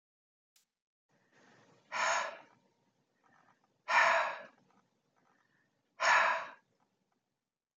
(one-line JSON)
{"exhalation_length": "7.8 s", "exhalation_amplitude": 6727, "exhalation_signal_mean_std_ratio": 0.32, "survey_phase": "alpha (2021-03-01 to 2021-08-12)", "age": "65+", "gender": "Male", "wearing_mask": "No", "symptom_none": true, "smoker_status": "Never smoked", "respiratory_condition_asthma": false, "respiratory_condition_other": false, "recruitment_source": "REACT", "submission_delay": "3 days", "covid_test_result": "Negative", "covid_test_method": "RT-qPCR"}